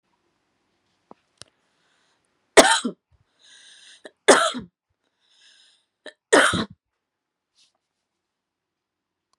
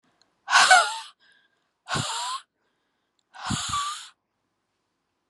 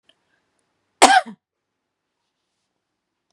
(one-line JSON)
{"three_cough_length": "9.4 s", "three_cough_amplitude": 32768, "three_cough_signal_mean_std_ratio": 0.21, "exhalation_length": "5.3 s", "exhalation_amplitude": 24812, "exhalation_signal_mean_std_ratio": 0.35, "cough_length": "3.3 s", "cough_amplitude": 32768, "cough_signal_mean_std_ratio": 0.19, "survey_phase": "beta (2021-08-13 to 2022-03-07)", "age": "18-44", "gender": "Female", "wearing_mask": "No", "symptom_runny_or_blocked_nose": true, "symptom_onset": "13 days", "smoker_status": "Current smoker (e-cigarettes or vapes only)", "respiratory_condition_asthma": false, "respiratory_condition_other": false, "recruitment_source": "REACT", "submission_delay": "2 days", "covid_test_result": "Negative", "covid_test_method": "RT-qPCR", "influenza_a_test_result": "Negative", "influenza_b_test_result": "Negative"}